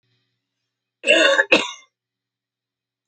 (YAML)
cough_length: 3.1 s
cough_amplitude: 29227
cough_signal_mean_std_ratio: 0.33
survey_phase: alpha (2021-03-01 to 2021-08-12)
age: 45-64
gender: Female
wearing_mask: 'No'
symptom_none: true
smoker_status: Current smoker (11 or more cigarettes per day)
respiratory_condition_asthma: false
respiratory_condition_other: false
recruitment_source: REACT
submission_delay: 2 days
covid_test_result: Negative
covid_test_method: RT-qPCR